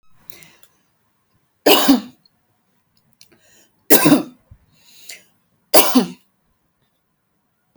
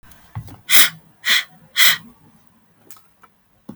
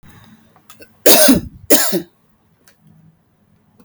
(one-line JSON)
{"three_cough_length": "7.8 s", "three_cough_amplitude": 32768, "three_cough_signal_mean_std_ratio": 0.28, "exhalation_length": "3.8 s", "exhalation_amplitude": 32768, "exhalation_signal_mean_std_ratio": 0.32, "cough_length": "3.8 s", "cough_amplitude": 32768, "cough_signal_mean_std_ratio": 0.34, "survey_phase": "beta (2021-08-13 to 2022-03-07)", "age": "18-44", "gender": "Female", "wearing_mask": "No", "symptom_none": true, "symptom_onset": "12 days", "smoker_status": "Never smoked", "respiratory_condition_asthma": false, "respiratory_condition_other": false, "recruitment_source": "REACT", "submission_delay": "5 days", "covid_test_result": "Negative", "covid_test_method": "RT-qPCR"}